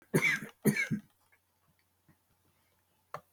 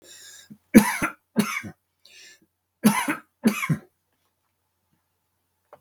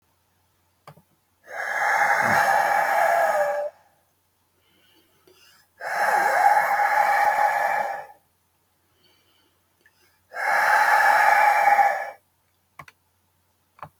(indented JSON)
{
  "cough_length": "3.3 s",
  "cough_amplitude": 6872,
  "cough_signal_mean_std_ratio": 0.33,
  "three_cough_length": "5.8 s",
  "three_cough_amplitude": 32768,
  "three_cough_signal_mean_std_ratio": 0.29,
  "exhalation_length": "14.0 s",
  "exhalation_amplitude": 18749,
  "exhalation_signal_mean_std_ratio": 0.59,
  "survey_phase": "beta (2021-08-13 to 2022-03-07)",
  "age": "65+",
  "gender": "Male",
  "wearing_mask": "No",
  "symptom_none": true,
  "smoker_status": "Ex-smoker",
  "respiratory_condition_asthma": false,
  "respiratory_condition_other": false,
  "recruitment_source": "REACT",
  "submission_delay": "3 days",
  "covid_test_result": "Negative",
  "covid_test_method": "RT-qPCR"
}